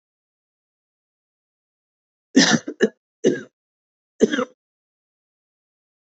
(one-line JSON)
{"three_cough_length": "6.1 s", "three_cough_amplitude": 28511, "three_cough_signal_mean_std_ratio": 0.24, "survey_phase": "beta (2021-08-13 to 2022-03-07)", "age": "45-64", "gender": "Female", "wearing_mask": "No", "symptom_cough_any": true, "symptom_fatigue": true, "symptom_headache": true, "symptom_change_to_sense_of_smell_or_taste": true, "symptom_onset": "4 days", "smoker_status": "Never smoked", "respiratory_condition_asthma": false, "respiratory_condition_other": false, "recruitment_source": "Test and Trace", "submission_delay": "2 days", "covid_test_result": "Positive", "covid_test_method": "RT-qPCR"}